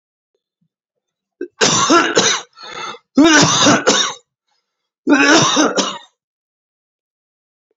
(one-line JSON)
{"three_cough_length": "7.8 s", "three_cough_amplitude": 31381, "three_cough_signal_mean_std_ratio": 0.49, "survey_phase": "beta (2021-08-13 to 2022-03-07)", "age": "45-64", "gender": "Male", "wearing_mask": "No", "symptom_cough_any": true, "symptom_new_continuous_cough": true, "symptom_runny_or_blocked_nose": true, "symptom_sore_throat": true, "symptom_onset": "3 days", "smoker_status": "Never smoked", "respiratory_condition_asthma": false, "respiratory_condition_other": false, "recruitment_source": "Test and Trace", "submission_delay": "-1 day", "covid_test_result": "Positive", "covid_test_method": "RT-qPCR", "covid_ct_value": 18.1, "covid_ct_gene": "N gene"}